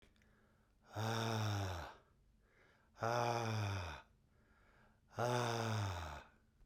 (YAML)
exhalation_length: 6.7 s
exhalation_amplitude: 2193
exhalation_signal_mean_std_ratio: 0.6
survey_phase: beta (2021-08-13 to 2022-03-07)
age: 65+
gender: Male
wearing_mask: 'No'
symptom_runny_or_blocked_nose: true
smoker_status: Never smoked
respiratory_condition_asthma: false
respiratory_condition_other: false
recruitment_source: Test and Trace
submission_delay: 2 days
covid_test_result: Positive
covid_test_method: RT-qPCR